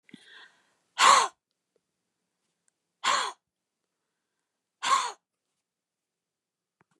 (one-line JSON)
{"exhalation_length": "7.0 s", "exhalation_amplitude": 15978, "exhalation_signal_mean_std_ratio": 0.25, "survey_phase": "beta (2021-08-13 to 2022-03-07)", "age": "65+", "gender": "Female", "wearing_mask": "No", "symptom_none": true, "smoker_status": "Never smoked", "respiratory_condition_asthma": false, "respiratory_condition_other": false, "recruitment_source": "REACT", "submission_delay": "1 day", "covid_test_result": "Negative", "covid_test_method": "RT-qPCR", "influenza_a_test_result": "Negative", "influenza_b_test_result": "Negative"}